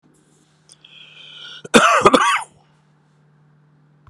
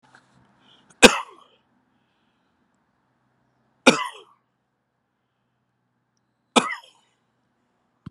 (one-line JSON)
{"cough_length": "4.1 s", "cough_amplitude": 32768, "cough_signal_mean_std_ratio": 0.32, "three_cough_length": "8.1 s", "three_cough_amplitude": 32768, "three_cough_signal_mean_std_ratio": 0.15, "survey_phase": "beta (2021-08-13 to 2022-03-07)", "age": "65+", "gender": "Male", "wearing_mask": "No", "symptom_runny_or_blocked_nose": true, "symptom_change_to_sense_of_smell_or_taste": true, "symptom_loss_of_taste": true, "symptom_onset": "3 days", "smoker_status": "Never smoked", "respiratory_condition_asthma": false, "respiratory_condition_other": false, "recruitment_source": "Test and Trace", "submission_delay": "2 days", "covid_test_result": "Positive", "covid_test_method": "RT-qPCR", "covid_ct_value": 16.9, "covid_ct_gene": "ORF1ab gene", "covid_ct_mean": 17.5, "covid_viral_load": "1800000 copies/ml", "covid_viral_load_category": "High viral load (>1M copies/ml)"}